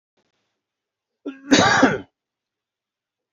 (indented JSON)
{
  "cough_length": "3.3 s",
  "cough_amplitude": 27668,
  "cough_signal_mean_std_ratio": 0.31,
  "survey_phase": "beta (2021-08-13 to 2022-03-07)",
  "age": "45-64",
  "gender": "Male",
  "wearing_mask": "No",
  "symptom_cough_any": true,
  "symptom_runny_or_blocked_nose": true,
  "symptom_fatigue": true,
  "smoker_status": "Ex-smoker",
  "respiratory_condition_asthma": false,
  "respiratory_condition_other": false,
  "recruitment_source": "Test and Trace",
  "submission_delay": "1 day",
  "covid_test_result": "Positive",
  "covid_test_method": "RT-qPCR",
  "covid_ct_value": 28.6,
  "covid_ct_gene": "N gene"
}